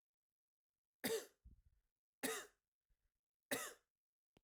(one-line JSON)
{"three_cough_length": "4.4 s", "three_cough_amplitude": 1484, "three_cough_signal_mean_std_ratio": 0.29, "survey_phase": "alpha (2021-03-01 to 2021-08-12)", "age": "45-64", "gender": "Male", "wearing_mask": "No", "symptom_none": true, "smoker_status": "Never smoked", "respiratory_condition_asthma": false, "respiratory_condition_other": false, "recruitment_source": "REACT", "submission_delay": "2 days", "covid_test_result": "Negative", "covid_test_method": "RT-qPCR"}